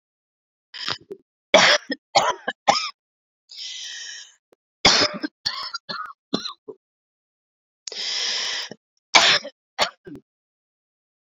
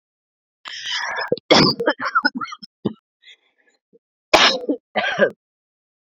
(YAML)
three_cough_length: 11.3 s
three_cough_amplitude: 32768
three_cough_signal_mean_std_ratio: 0.35
cough_length: 6.1 s
cough_amplitude: 32768
cough_signal_mean_std_ratio: 0.41
survey_phase: beta (2021-08-13 to 2022-03-07)
age: 45-64
gender: Female
wearing_mask: 'No'
symptom_runny_or_blocked_nose: true
symptom_onset: 12 days
smoker_status: Current smoker (1 to 10 cigarettes per day)
respiratory_condition_asthma: false
respiratory_condition_other: true
recruitment_source: REACT
submission_delay: 0 days
covid_test_result: Negative
covid_test_method: RT-qPCR